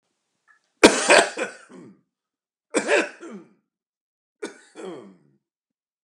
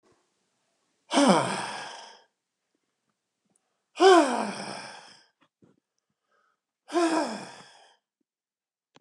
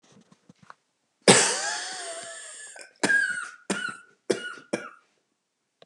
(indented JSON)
{
  "three_cough_length": "6.0 s",
  "three_cough_amplitude": 32768,
  "three_cough_signal_mean_std_ratio": 0.27,
  "exhalation_length": "9.0 s",
  "exhalation_amplitude": 18888,
  "exhalation_signal_mean_std_ratio": 0.31,
  "cough_length": "5.9 s",
  "cough_amplitude": 29165,
  "cough_signal_mean_std_ratio": 0.38,
  "survey_phase": "beta (2021-08-13 to 2022-03-07)",
  "age": "65+",
  "gender": "Male",
  "wearing_mask": "No",
  "symptom_none": true,
  "smoker_status": "Ex-smoker",
  "respiratory_condition_asthma": false,
  "respiratory_condition_other": false,
  "recruitment_source": "REACT",
  "submission_delay": "1 day",
  "covid_test_result": "Negative",
  "covid_test_method": "RT-qPCR",
  "influenza_a_test_result": "Negative",
  "influenza_b_test_result": "Negative"
}